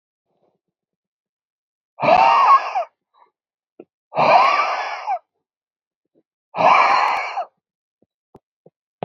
{
  "exhalation_length": "9.0 s",
  "exhalation_amplitude": 26964,
  "exhalation_signal_mean_std_ratio": 0.42,
  "survey_phase": "beta (2021-08-13 to 2022-03-07)",
  "age": "18-44",
  "gender": "Male",
  "wearing_mask": "No",
  "symptom_cough_any": true,
  "smoker_status": "Ex-smoker",
  "respiratory_condition_asthma": false,
  "respiratory_condition_other": false,
  "recruitment_source": "REACT",
  "submission_delay": "2 days",
  "covid_test_result": "Negative",
  "covid_test_method": "RT-qPCR",
  "influenza_a_test_result": "Unknown/Void",
  "influenza_b_test_result": "Unknown/Void"
}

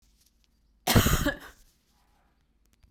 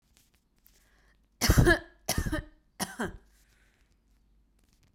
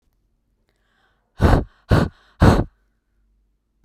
{
  "cough_length": "2.9 s",
  "cough_amplitude": 15784,
  "cough_signal_mean_std_ratio": 0.31,
  "three_cough_length": "4.9 s",
  "three_cough_amplitude": 12627,
  "three_cough_signal_mean_std_ratio": 0.29,
  "exhalation_length": "3.8 s",
  "exhalation_amplitude": 32768,
  "exhalation_signal_mean_std_ratio": 0.31,
  "survey_phase": "beta (2021-08-13 to 2022-03-07)",
  "age": "18-44",
  "gender": "Female",
  "wearing_mask": "No",
  "symptom_sore_throat": true,
  "symptom_onset": "3 days",
  "smoker_status": "Never smoked",
  "respiratory_condition_asthma": false,
  "respiratory_condition_other": false,
  "recruitment_source": "Test and Trace",
  "submission_delay": "2 days",
  "covid_test_result": "Positive",
  "covid_test_method": "RT-qPCR",
  "covid_ct_value": 31.3,
  "covid_ct_gene": "ORF1ab gene",
  "covid_ct_mean": 32.3,
  "covid_viral_load": "26 copies/ml",
  "covid_viral_load_category": "Minimal viral load (< 10K copies/ml)"
}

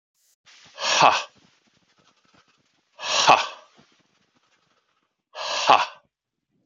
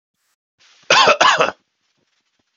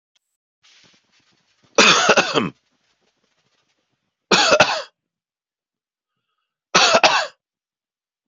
{
  "exhalation_length": "6.7 s",
  "exhalation_amplitude": 32768,
  "exhalation_signal_mean_std_ratio": 0.3,
  "cough_length": "2.6 s",
  "cough_amplitude": 32552,
  "cough_signal_mean_std_ratio": 0.37,
  "three_cough_length": "8.3 s",
  "three_cough_amplitude": 32767,
  "three_cough_signal_mean_std_ratio": 0.34,
  "survey_phase": "beta (2021-08-13 to 2022-03-07)",
  "age": "45-64",
  "gender": "Male",
  "wearing_mask": "No",
  "symptom_none": true,
  "smoker_status": "Never smoked",
  "respiratory_condition_asthma": false,
  "respiratory_condition_other": false,
  "recruitment_source": "Test and Trace",
  "submission_delay": "1 day",
  "covid_test_result": "Positive",
  "covid_test_method": "LFT"
}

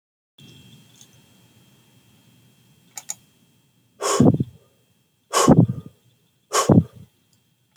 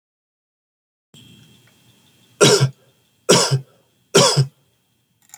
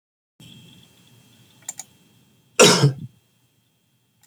{
  "exhalation_length": "7.8 s",
  "exhalation_amplitude": 28352,
  "exhalation_signal_mean_std_ratio": 0.29,
  "three_cough_length": "5.4 s",
  "three_cough_amplitude": 30552,
  "three_cough_signal_mean_std_ratio": 0.33,
  "cough_length": "4.3 s",
  "cough_amplitude": 30279,
  "cough_signal_mean_std_ratio": 0.24,
  "survey_phase": "beta (2021-08-13 to 2022-03-07)",
  "age": "45-64",
  "gender": "Male",
  "wearing_mask": "No",
  "symptom_none": true,
  "smoker_status": "Never smoked",
  "respiratory_condition_asthma": false,
  "respiratory_condition_other": false,
  "recruitment_source": "REACT",
  "submission_delay": "6 days",
  "covid_test_result": "Negative",
  "covid_test_method": "RT-qPCR"
}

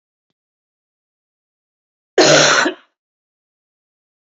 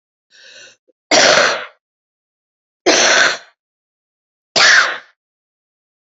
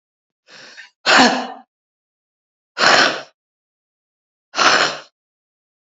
{
  "cough_length": "4.4 s",
  "cough_amplitude": 31986,
  "cough_signal_mean_std_ratio": 0.28,
  "three_cough_length": "6.1 s",
  "three_cough_amplitude": 32768,
  "three_cough_signal_mean_std_ratio": 0.4,
  "exhalation_length": "5.9 s",
  "exhalation_amplitude": 30545,
  "exhalation_signal_mean_std_ratio": 0.35,
  "survey_phase": "beta (2021-08-13 to 2022-03-07)",
  "age": "65+",
  "gender": "Female",
  "wearing_mask": "No",
  "symptom_cough_any": true,
  "symptom_runny_or_blocked_nose": true,
  "symptom_shortness_of_breath": true,
  "symptom_fatigue": true,
  "symptom_headache": true,
  "smoker_status": "Ex-smoker",
  "respiratory_condition_asthma": true,
  "respiratory_condition_other": false,
  "recruitment_source": "Test and Trace",
  "submission_delay": "1 day",
  "covid_test_result": "Positive",
  "covid_test_method": "LFT"
}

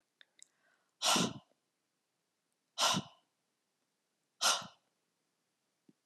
{
  "exhalation_length": "6.1 s",
  "exhalation_amplitude": 5044,
  "exhalation_signal_mean_std_ratio": 0.28,
  "survey_phase": "beta (2021-08-13 to 2022-03-07)",
  "age": "45-64",
  "gender": "Female",
  "wearing_mask": "No",
  "symptom_runny_or_blocked_nose": true,
  "symptom_sore_throat": true,
  "symptom_fatigue": true,
  "symptom_headache": true,
  "symptom_change_to_sense_of_smell_or_taste": true,
  "symptom_loss_of_taste": true,
  "symptom_onset": "5 days",
  "smoker_status": "Ex-smoker",
  "respiratory_condition_asthma": false,
  "respiratory_condition_other": false,
  "recruitment_source": "Test and Trace",
  "submission_delay": "2 days",
  "covid_test_result": "Positive",
  "covid_test_method": "RT-qPCR",
  "covid_ct_value": 14.0,
  "covid_ct_gene": "N gene"
}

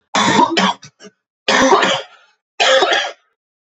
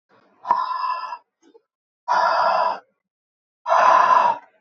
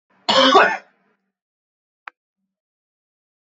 {
  "three_cough_length": "3.7 s",
  "three_cough_amplitude": 31465,
  "three_cough_signal_mean_std_ratio": 0.59,
  "exhalation_length": "4.6 s",
  "exhalation_amplitude": 23675,
  "exhalation_signal_mean_std_ratio": 0.55,
  "cough_length": "3.4 s",
  "cough_amplitude": 26864,
  "cough_signal_mean_std_ratio": 0.29,
  "survey_phase": "beta (2021-08-13 to 2022-03-07)",
  "age": "18-44",
  "gender": "Male",
  "wearing_mask": "No",
  "symptom_cough_any": true,
  "symptom_runny_or_blocked_nose": true,
  "symptom_shortness_of_breath": true,
  "symptom_sore_throat": true,
  "symptom_fatigue": true,
  "symptom_fever_high_temperature": true,
  "symptom_headache": true,
  "smoker_status": "Never smoked",
  "respiratory_condition_asthma": false,
  "respiratory_condition_other": false,
  "recruitment_source": "Test and Trace",
  "submission_delay": "1 day",
  "covid_test_result": "Positive",
  "covid_test_method": "LFT"
}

